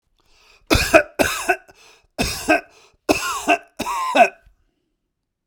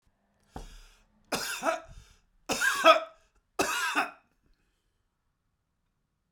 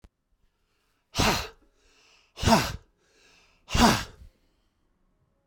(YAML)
cough_length: 5.5 s
cough_amplitude: 32768
cough_signal_mean_std_ratio: 0.41
three_cough_length: 6.3 s
three_cough_amplitude: 17929
three_cough_signal_mean_std_ratio: 0.33
exhalation_length: 5.5 s
exhalation_amplitude: 17597
exhalation_signal_mean_std_ratio: 0.31
survey_phase: beta (2021-08-13 to 2022-03-07)
age: 65+
gender: Male
wearing_mask: 'No'
symptom_sore_throat: true
symptom_onset: 12 days
smoker_status: Ex-smoker
respiratory_condition_asthma: false
respiratory_condition_other: false
recruitment_source: REACT
submission_delay: 0 days
covid_test_result: Negative
covid_test_method: RT-qPCR
influenza_a_test_result: Negative
influenza_b_test_result: Negative